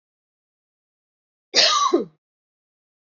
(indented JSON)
{
  "cough_length": "3.1 s",
  "cough_amplitude": 26340,
  "cough_signal_mean_std_ratio": 0.32,
  "survey_phase": "alpha (2021-03-01 to 2021-08-12)",
  "age": "18-44",
  "gender": "Female",
  "wearing_mask": "No",
  "symptom_fatigue": true,
  "symptom_headache": true,
  "smoker_status": "Ex-smoker",
  "respiratory_condition_asthma": false,
  "respiratory_condition_other": false,
  "recruitment_source": "REACT",
  "submission_delay": "1 day",
  "covid_test_result": "Negative",
  "covid_test_method": "RT-qPCR"
}